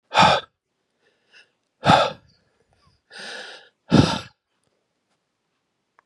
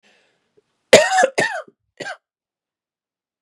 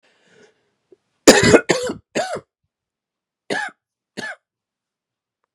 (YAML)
exhalation_length: 6.1 s
exhalation_amplitude: 29391
exhalation_signal_mean_std_ratio: 0.29
cough_length: 3.4 s
cough_amplitude: 32768
cough_signal_mean_std_ratio: 0.29
three_cough_length: 5.5 s
three_cough_amplitude: 32768
three_cough_signal_mean_std_ratio: 0.27
survey_phase: beta (2021-08-13 to 2022-03-07)
age: 18-44
gender: Male
wearing_mask: 'No'
symptom_cough_any: true
symptom_new_continuous_cough: true
symptom_shortness_of_breath: true
symptom_sore_throat: true
symptom_diarrhoea: true
symptom_fatigue: true
symptom_fever_high_temperature: true
symptom_headache: true
symptom_change_to_sense_of_smell_or_taste: true
symptom_onset: 3 days
smoker_status: Current smoker (e-cigarettes or vapes only)
respiratory_condition_asthma: false
respiratory_condition_other: false
recruitment_source: Test and Trace
submission_delay: 1 day
covid_test_result: Positive
covid_test_method: RT-qPCR